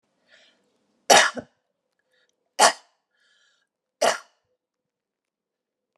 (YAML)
three_cough_length: 6.0 s
three_cough_amplitude: 32010
three_cough_signal_mean_std_ratio: 0.21
survey_phase: beta (2021-08-13 to 2022-03-07)
age: 45-64
gender: Female
wearing_mask: 'No'
symptom_cough_any: true
symptom_runny_or_blocked_nose: true
symptom_sore_throat: true
symptom_fatigue: true
symptom_change_to_sense_of_smell_or_taste: true
symptom_loss_of_taste: true
symptom_onset: 4 days
smoker_status: Never smoked
respiratory_condition_asthma: false
respiratory_condition_other: false
recruitment_source: Test and Trace
submission_delay: 2 days
covid_test_result: Positive
covid_test_method: RT-qPCR
covid_ct_value: 18.3
covid_ct_gene: ORF1ab gene
covid_ct_mean: 18.8
covid_viral_load: 690000 copies/ml
covid_viral_load_category: Low viral load (10K-1M copies/ml)